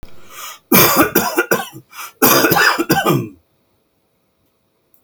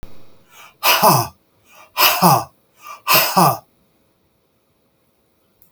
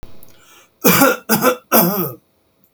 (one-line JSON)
{"cough_length": "5.0 s", "cough_amplitude": 32768, "cough_signal_mean_std_ratio": 0.51, "exhalation_length": "5.7 s", "exhalation_amplitude": 32768, "exhalation_signal_mean_std_ratio": 0.41, "three_cough_length": "2.7 s", "three_cough_amplitude": 32768, "three_cough_signal_mean_std_ratio": 0.51, "survey_phase": "beta (2021-08-13 to 2022-03-07)", "age": "45-64", "gender": "Male", "wearing_mask": "No", "symptom_none": true, "smoker_status": "Never smoked", "respiratory_condition_asthma": false, "respiratory_condition_other": false, "recruitment_source": "REACT", "submission_delay": "2 days", "covid_test_result": "Negative", "covid_test_method": "RT-qPCR"}